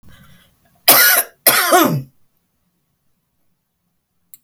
cough_length: 4.4 s
cough_amplitude: 32768
cough_signal_mean_std_ratio: 0.37
survey_phase: beta (2021-08-13 to 2022-03-07)
age: 45-64
gender: Female
wearing_mask: 'No'
symptom_none: true
smoker_status: Ex-smoker
respiratory_condition_asthma: false
respiratory_condition_other: false
recruitment_source: REACT
submission_delay: 1 day
covid_test_result: Negative
covid_test_method: RT-qPCR
influenza_a_test_result: Negative
influenza_b_test_result: Negative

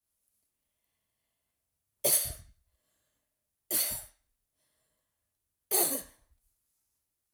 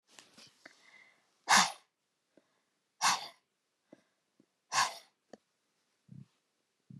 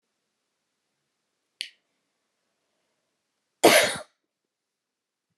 three_cough_length: 7.3 s
three_cough_amplitude: 8364
three_cough_signal_mean_std_ratio: 0.27
exhalation_length: 7.0 s
exhalation_amplitude: 8942
exhalation_signal_mean_std_ratio: 0.23
cough_length: 5.4 s
cough_amplitude: 23088
cough_signal_mean_std_ratio: 0.18
survey_phase: alpha (2021-03-01 to 2021-08-12)
age: 45-64
gender: Female
wearing_mask: 'No'
symptom_none: true
smoker_status: Never smoked
respiratory_condition_asthma: true
respiratory_condition_other: false
recruitment_source: REACT
submission_delay: 1 day
covid_test_result: Negative
covid_test_method: RT-qPCR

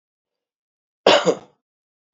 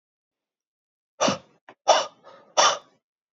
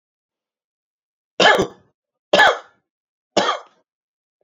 cough_length: 2.1 s
cough_amplitude: 32767
cough_signal_mean_std_ratio: 0.26
exhalation_length: 3.3 s
exhalation_amplitude: 21767
exhalation_signal_mean_std_ratio: 0.31
three_cough_length: 4.4 s
three_cough_amplitude: 29698
three_cough_signal_mean_std_ratio: 0.3
survey_phase: beta (2021-08-13 to 2022-03-07)
age: 45-64
gender: Male
wearing_mask: 'No'
symptom_none: true
smoker_status: Ex-smoker
respiratory_condition_asthma: false
respiratory_condition_other: false
recruitment_source: REACT
submission_delay: 1 day
covid_test_result: Negative
covid_test_method: RT-qPCR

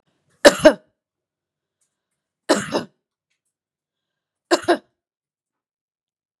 three_cough_length: 6.4 s
three_cough_amplitude: 32768
three_cough_signal_mean_std_ratio: 0.2
survey_phase: beta (2021-08-13 to 2022-03-07)
age: 18-44
gender: Female
wearing_mask: 'No'
symptom_none: true
smoker_status: Never smoked
respiratory_condition_asthma: false
respiratory_condition_other: false
recruitment_source: REACT
submission_delay: 6 days
covid_test_result: Negative
covid_test_method: RT-qPCR
influenza_a_test_result: Unknown/Void
influenza_b_test_result: Unknown/Void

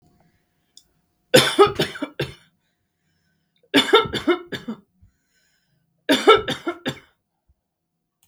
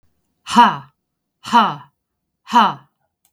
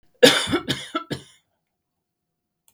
three_cough_length: 8.3 s
three_cough_amplitude: 32768
three_cough_signal_mean_std_ratio: 0.31
exhalation_length: 3.3 s
exhalation_amplitude: 32768
exhalation_signal_mean_std_ratio: 0.35
cough_length: 2.7 s
cough_amplitude: 32768
cough_signal_mean_std_ratio: 0.3
survey_phase: beta (2021-08-13 to 2022-03-07)
age: 45-64
gender: Female
wearing_mask: 'No'
symptom_none: true
smoker_status: Never smoked
respiratory_condition_asthma: false
respiratory_condition_other: false
recruitment_source: REACT
submission_delay: 3 days
covid_test_result: Negative
covid_test_method: RT-qPCR
influenza_a_test_result: Negative
influenza_b_test_result: Negative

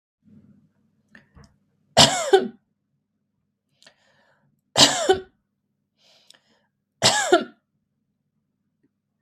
three_cough_length: 9.2 s
three_cough_amplitude: 32767
three_cough_signal_mean_std_ratio: 0.26
survey_phase: beta (2021-08-13 to 2022-03-07)
age: 45-64
gender: Female
wearing_mask: 'No'
symptom_none: true
smoker_status: Ex-smoker
respiratory_condition_asthma: false
respiratory_condition_other: false
recruitment_source: REACT
submission_delay: 6 days
covid_test_result: Negative
covid_test_method: RT-qPCR
influenza_a_test_result: Negative
influenza_b_test_result: Negative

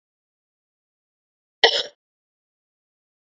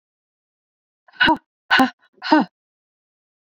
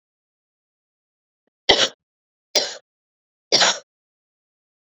cough_length: 3.3 s
cough_amplitude: 30958
cough_signal_mean_std_ratio: 0.16
exhalation_length: 3.4 s
exhalation_amplitude: 27534
exhalation_signal_mean_std_ratio: 0.31
three_cough_length: 4.9 s
three_cough_amplitude: 28961
three_cough_signal_mean_std_ratio: 0.25
survey_phase: beta (2021-08-13 to 2022-03-07)
age: 45-64
gender: Female
wearing_mask: 'No'
symptom_cough_any: true
symptom_runny_or_blocked_nose: true
symptom_sore_throat: true
symptom_fatigue: true
symptom_change_to_sense_of_smell_or_taste: true
symptom_onset: 3 days
smoker_status: Never smoked
respiratory_condition_asthma: false
respiratory_condition_other: false
recruitment_source: Test and Trace
submission_delay: 2 days
covid_test_result: Positive
covid_test_method: LAMP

